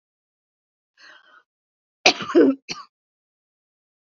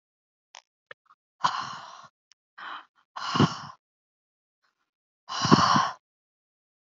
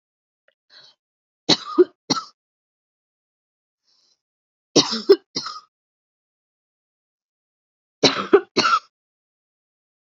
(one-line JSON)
{"cough_length": "4.1 s", "cough_amplitude": 30393, "cough_signal_mean_std_ratio": 0.24, "exhalation_length": "6.9 s", "exhalation_amplitude": 25703, "exhalation_signal_mean_std_ratio": 0.3, "three_cough_length": "10.1 s", "three_cough_amplitude": 29431, "three_cough_signal_mean_std_ratio": 0.24, "survey_phase": "beta (2021-08-13 to 2022-03-07)", "age": "45-64", "gender": "Female", "wearing_mask": "No", "symptom_cough_any": true, "symptom_runny_or_blocked_nose": true, "smoker_status": "Ex-smoker", "respiratory_condition_asthma": false, "respiratory_condition_other": false, "recruitment_source": "REACT", "submission_delay": "1 day", "covid_test_result": "Negative", "covid_test_method": "RT-qPCR", "covid_ct_value": 37.0, "covid_ct_gene": "N gene", "influenza_a_test_result": "Negative", "influenza_b_test_result": "Negative"}